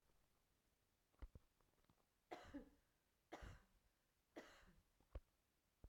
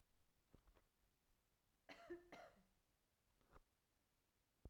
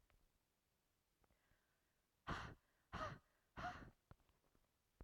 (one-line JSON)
{"three_cough_length": "5.9 s", "three_cough_amplitude": 289, "three_cough_signal_mean_std_ratio": 0.39, "cough_length": "4.7 s", "cough_amplitude": 178, "cough_signal_mean_std_ratio": 0.4, "exhalation_length": "5.0 s", "exhalation_amplitude": 588, "exhalation_signal_mean_std_ratio": 0.35, "survey_phase": "beta (2021-08-13 to 2022-03-07)", "age": "18-44", "gender": "Female", "wearing_mask": "No", "symptom_cough_any": true, "symptom_runny_or_blocked_nose": true, "symptom_shortness_of_breath": true, "symptom_fatigue": true, "symptom_headache": true, "symptom_change_to_sense_of_smell_or_taste": true, "symptom_onset": "2 days", "smoker_status": "Ex-smoker", "respiratory_condition_asthma": false, "respiratory_condition_other": false, "recruitment_source": "Test and Trace", "submission_delay": "1 day", "covid_test_result": "Positive", "covid_test_method": "RT-qPCR"}